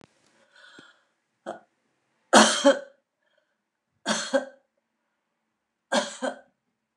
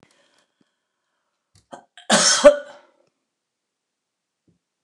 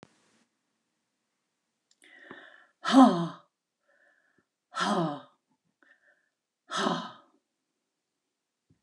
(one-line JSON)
{"three_cough_length": "7.0 s", "three_cough_amplitude": 24763, "three_cough_signal_mean_std_ratio": 0.26, "cough_length": "4.8 s", "cough_amplitude": 29204, "cough_signal_mean_std_ratio": 0.22, "exhalation_length": "8.8 s", "exhalation_amplitude": 15228, "exhalation_signal_mean_std_ratio": 0.24, "survey_phase": "beta (2021-08-13 to 2022-03-07)", "age": "65+", "gender": "Female", "wearing_mask": "No", "symptom_none": true, "smoker_status": "Ex-smoker", "respiratory_condition_asthma": false, "respiratory_condition_other": false, "recruitment_source": "REACT", "submission_delay": "1 day", "covid_test_result": "Negative", "covid_test_method": "RT-qPCR"}